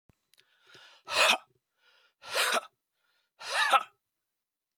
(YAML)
exhalation_length: 4.8 s
exhalation_amplitude: 10720
exhalation_signal_mean_std_ratio: 0.34
survey_phase: beta (2021-08-13 to 2022-03-07)
age: 45-64
gender: Male
wearing_mask: 'No'
symptom_cough_any: true
symptom_runny_or_blocked_nose: true
symptom_sore_throat: true
symptom_headache: true
symptom_onset: 6 days
smoker_status: Never smoked
respiratory_condition_asthma: false
respiratory_condition_other: false
recruitment_source: Test and Trace
submission_delay: 1 day
covid_test_result: Positive
covid_test_method: RT-qPCR
covid_ct_value: 14.6
covid_ct_gene: ORF1ab gene